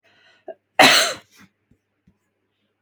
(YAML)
cough_length: 2.8 s
cough_amplitude: 32768
cough_signal_mean_std_ratio: 0.27
survey_phase: beta (2021-08-13 to 2022-03-07)
age: 18-44
gender: Female
wearing_mask: 'No'
symptom_none: true
smoker_status: Never smoked
respiratory_condition_asthma: false
respiratory_condition_other: false
recruitment_source: REACT
submission_delay: 2 days
covid_test_result: Negative
covid_test_method: RT-qPCR
influenza_a_test_result: Negative
influenza_b_test_result: Negative